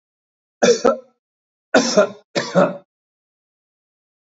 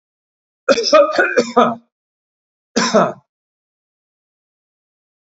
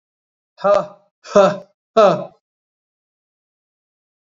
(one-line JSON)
{"three_cough_length": "4.3 s", "three_cough_amplitude": 27245, "three_cough_signal_mean_std_ratio": 0.35, "cough_length": "5.2 s", "cough_amplitude": 28558, "cough_signal_mean_std_ratio": 0.37, "exhalation_length": "4.3 s", "exhalation_amplitude": 29036, "exhalation_signal_mean_std_ratio": 0.31, "survey_phase": "beta (2021-08-13 to 2022-03-07)", "age": "65+", "gender": "Male", "wearing_mask": "No", "symptom_runny_or_blocked_nose": true, "symptom_abdominal_pain": true, "symptom_fatigue": true, "symptom_onset": "12 days", "smoker_status": "Never smoked", "respiratory_condition_asthma": false, "respiratory_condition_other": false, "recruitment_source": "REACT", "submission_delay": "2 days", "covid_test_result": "Negative", "covid_test_method": "RT-qPCR", "influenza_a_test_result": "Negative", "influenza_b_test_result": "Negative"}